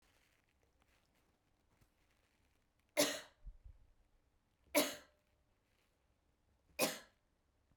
three_cough_length: 7.8 s
three_cough_amplitude: 3434
three_cough_signal_mean_std_ratio: 0.22
survey_phase: beta (2021-08-13 to 2022-03-07)
age: 45-64
gender: Female
wearing_mask: 'No'
symptom_runny_or_blocked_nose: true
symptom_fever_high_temperature: true
symptom_other: true
symptom_onset: 3 days
smoker_status: Never smoked
respiratory_condition_asthma: false
respiratory_condition_other: false
recruitment_source: Test and Trace
submission_delay: 1 day
covid_test_result: Positive
covid_test_method: RT-qPCR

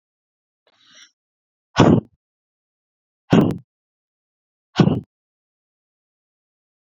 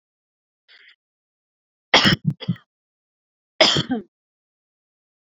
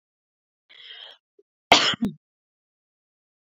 exhalation_length: 6.8 s
exhalation_amplitude: 32767
exhalation_signal_mean_std_ratio: 0.23
three_cough_length: 5.4 s
three_cough_amplitude: 32768
three_cough_signal_mean_std_ratio: 0.26
cough_length: 3.6 s
cough_amplitude: 29657
cough_signal_mean_std_ratio: 0.22
survey_phase: beta (2021-08-13 to 2022-03-07)
age: 18-44
gender: Female
wearing_mask: 'No'
symptom_fatigue: true
symptom_headache: true
smoker_status: Current smoker (1 to 10 cigarettes per day)
respiratory_condition_asthma: false
respiratory_condition_other: false
recruitment_source: REACT
submission_delay: 12 days
covid_test_result: Negative
covid_test_method: RT-qPCR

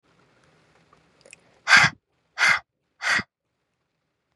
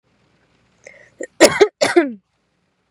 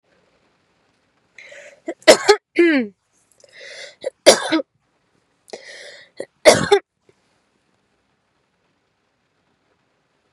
exhalation_length: 4.4 s
exhalation_amplitude: 26942
exhalation_signal_mean_std_ratio: 0.28
cough_length: 2.9 s
cough_amplitude: 32768
cough_signal_mean_std_ratio: 0.3
three_cough_length: 10.3 s
three_cough_amplitude: 32768
three_cough_signal_mean_std_ratio: 0.25
survey_phase: beta (2021-08-13 to 2022-03-07)
age: 18-44
gender: Female
wearing_mask: 'No'
symptom_runny_or_blocked_nose: true
symptom_sore_throat: true
symptom_headache: true
symptom_onset: 12 days
smoker_status: Current smoker (e-cigarettes or vapes only)
respiratory_condition_asthma: false
respiratory_condition_other: false
recruitment_source: REACT
submission_delay: 0 days
covid_test_result: Negative
covid_test_method: RT-qPCR
influenza_a_test_result: Negative
influenza_b_test_result: Negative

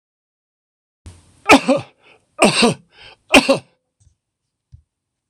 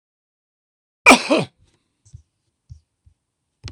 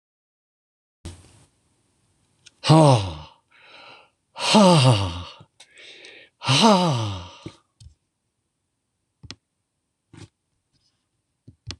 three_cough_length: 5.3 s
three_cough_amplitude: 26028
three_cough_signal_mean_std_ratio: 0.29
cough_length: 3.7 s
cough_amplitude: 26028
cough_signal_mean_std_ratio: 0.21
exhalation_length: 11.8 s
exhalation_amplitude: 26025
exhalation_signal_mean_std_ratio: 0.31
survey_phase: beta (2021-08-13 to 2022-03-07)
age: 65+
gender: Male
wearing_mask: 'No'
symptom_none: true
smoker_status: Ex-smoker
respiratory_condition_asthma: false
respiratory_condition_other: false
recruitment_source: REACT
submission_delay: 1 day
covid_test_result: Negative
covid_test_method: RT-qPCR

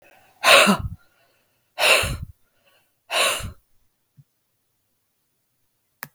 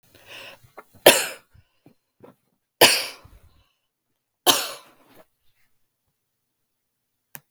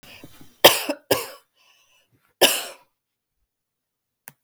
exhalation_length: 6.1 s
exhalation_amplitude: 32768
exhalation_signal_mean_std_ratio: 0.32
three_cough_length: 7.5 s
three_cough_amplitude: 32768
three_cough_signal_mean_std_ratio: 0.21
cough_length: 4.4 s
cough_amplitude: 32768
cough_signal_mean_std_ratio: 0.24
survey_phase: beta (2021-08-13 to 2022-03-07)
age: 45-64
gender: Female
wearing_mask: 'No'
symptom_cough_any: true
smoker_status: Never smoked
respiratory_condition_asthma: false
respiratory_condition_other: false
recruitment_source: REACT
submission_delay: 5 days
covid_test_result: Negative
covid_test_method: RT-qPCR
influenza_a_test_result: Unknown/Void
influenza_b_test_result: Unknown/Void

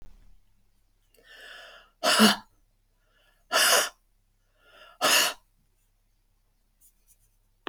exhalation_length: 7.7 s
exhalation_amplitude: 18964
exhalation_signal_mean_std_ratio: 0.3
survey_phase: beta (2021-08-13 to 2022-03-07)
age: 65+
gender: Female
wearing_mask: 'No'
symptom_none: true
smoker_status: Never smoked
respiratory_condition_asthma: false
respiratory_condition_other: false
recruitment_source: Test and Trace
submission_delay: 2 days
covid_test_result: Negative
covid_test_method: RT-qPCR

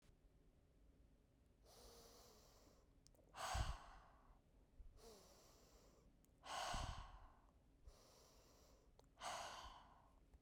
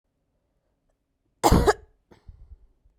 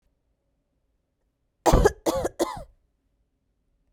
exhalation_length: 10.4 s
exhalation_amplitude: 950
exhalation_signal_mean_std_ratio: 0.47
cough_length: 3.0 s
cough_amplitude: 21994
cough_signal_mean_std_ratio: 0.25
three_cough_length: 3.9 s
three_cough_amplitude: 18832
three_cough_signal_mean_std_ratio: 0.28
survey_phase: beta (2021-08-13 to 2022-03-07)
age: 18-44
gender: Female
wearing_mask: 'No'
symptom_cough_any: true
symptom_runny_or_blocked_nose: true
symptom_headache: true
symptom_change_to_sense_of_smell_or_taste: true
symptom_loss_of_taste: true
symptom_other: true
symptom_onset: 4 days
smoker_status: Never smoked
respiratory_condition_asthma: false
respiratory_condition_other: false
recruitment_source: Test and Trace
submission_delay: 2 days
covid_test_result: Positive
covid_test_method: RT-qPCR
covid_ct_value: 15.3
covid_ct_gene: ORF1ab gene
covid_ct_mean: 16.3
covid_viral_load: 4700000 copies/ml
covid_viral_load_category: High viral load (>1M copies/ml)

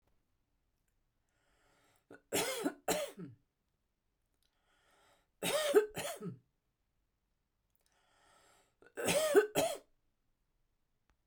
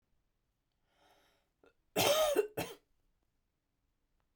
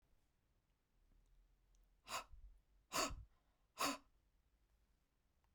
three_cough_length: 11.3 s
three_cough_amplitude: 5776
three_cough_signal_mean_std_ratio: 0.31
cough_length: 4.4 s
cough_amplitude: 5022
cough_signal_mean_std_ratio: 0.31
exhalation_length: 5.5 s
exhalation_amplitude: 1379
exhalation_signal_mean_std_ratio: 0.3
survey_phase: beta (2021-08-13 to 2022-03-07)
age: 45-64
gender: Female
wearing_mask: 'No'
symptom_none: true
smoker_status: Current smoker (1 to 10 cigarettes per day)
respiratory_condition_asthma: false
respiratory_condition_other: false
recruitment_source: Test and Trace
submission_delay: 1 day
covid_test_result: Negative
covid_test_method: LFT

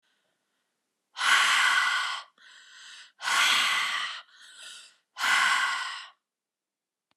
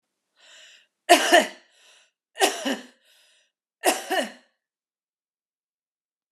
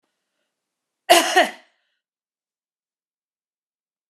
exhalation_length: 7.2 s
exhalation_amplitude: 12031
exhalation_signal_mean_std_ratio: 0.54
three_cough_length: 6.3 s
three_cough_amplitude: 29359
three_cough_signal_mean_std_ratio: 0.28
cough_length: 4.1 s
cough_amplitude: 32323
cough_signal_mean_std_ratio: 0.21
survey_phase: beta (2021-08-13 to 2022-03-07)
age: 45-64
gender: Female
wearing_mask: 'No'
symptom_fatigue: true
symptom_other: true
symptom_onset: 12 days
smoker_status: Never smoked
respiratory_condition_asthma: false
respiratory_condition_other: false
recruitment_source: REACT
submission_delay: 1 day
covid_test_result: Negative
covid_test_method: RT-qPCR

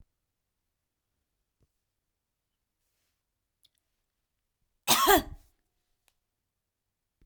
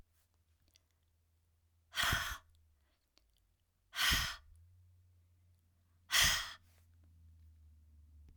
cough_length: 7.3 s
cough_amplitude: 16961
cough_signal_mean_std_ratio: 0.17
exhalation_length: 8.4 s
exhalation_amplitude: 4105
exhalation_signal_mean_std_ratio: 0.31
survey_phase: alpha (2021-03-01 to 2021-08-12)
age: 45-64
gender: Female
wearing_mask: 'No'
symptom_none: true
smoker_status: Never smoked
respiratory_condition_asthma: false
respiratory_condition_other: false
recruitment_source: REACT
submission_delay: 12 days
covid_test_result: Negative
covid_test_method: RT-qPCR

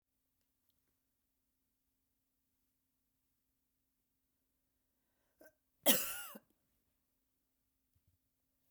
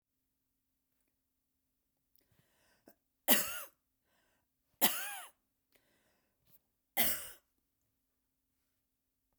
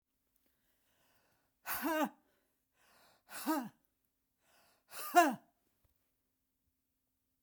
cough_length: 8.7 s
cough_amplitude: 7361
cough_signal_mean_std_ratio: 0.14
three_cough_length: 9.4 s
three_cough_amplitude: 10004
three_cough_signal_mean_std_ratio: 0.21
exhalation_length: 7.4 s
exhalation_amplitude: 6447
exhalation_signal_mean_std_ratio: 0.25
survey_phase: beta (2021-08-13 to 2022-03-07)
age: 65+
gender: Female
wearing_mask: 'No'
symptom_none: true
smoker_status: Never smoked
respiratory_condition_asthma: false
respiratory_condition_other: false
recruitment_source: REACT
submission_delay: 1 day
covid_test_result: Negative
covid_test_method: RT-qPCR
influenza_a_test_result: Negative
influenza_b_test_result: Negative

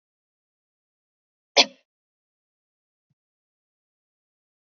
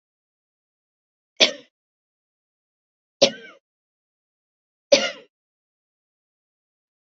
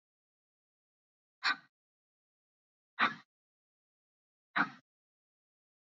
cough_length: 4.6 s
cough_amplitude: 29026
cough_signal_mean_std_ratio: 0.09
three_cough_length: 7.1 s
three_cough_amplitude: 30522
three_cough_signal_mean_std_ratio: 0.16
exhalation_length: 5.8 s
exhalation_amplitude: 5489
exhalation_signal_mean_std_ratio: 0.19
survey_phase: beta (2021-08-13 to 2022-03-07)
age: 45-64
gender: Female
wearing_mask: 'No'
symptom_none: true
smoker_status: Never smoked
respiratory_condition_asthma: true
respiratory_condition_other: false
recruitment_source: REACT
submission_delay: 2 days
covid_test_result: Negative
covid_test_method: RT-qPCR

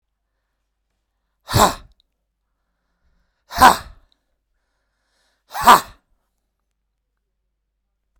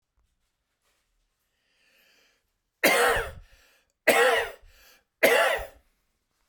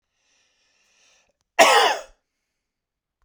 exhalation_length: 8.2 s
exhalation_amplitude: 32768
exhalation_signal_mean_std_ratio: 0.19
three_cough_length: 6.5 s
three_cough_amplitude: 17403
three_cough_signal_mean_std_ratio: 0.36
cough_length: 3.2 s
cough_amplitude: 32768
cough_signal_mean_std_ratio: 0.27
survey_phase: beta (2021-08-13 to 2022-03-07)
age: 45-64
gender: Male
wearing_mask: 'No'
symptom_none: true
smoker_status: Never smoked
respiratory_condition_asthma: false
respiratory_condition_other: false
recruitment_source: REACT
submission_delay: 4 days
covid_test_result: Negative
covid_test_method: RT-qPCR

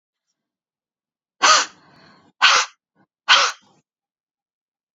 exhalation_length: 4.9 s
exhalation_amplitude: 32701
exhalation_signal_mean_std_ratio: 0.29
survey_phase: beta (2021-08-13 to 2022-03-07)
age: 45-64
gender: Female
wearing_mask: 'No'
symptom_diarrhoea: true
symptom_headache: true
smoker_status: Never smoked
respiratory_condition_asthma: false
respiratory_condition_other: false
recruitment_source: Test and Trace
submission_delay: 1 day
covid_test_result: Positive
covid_test_method: RT-qPCR
covid_ct_value: 30.2
covid_ct_gene: N gene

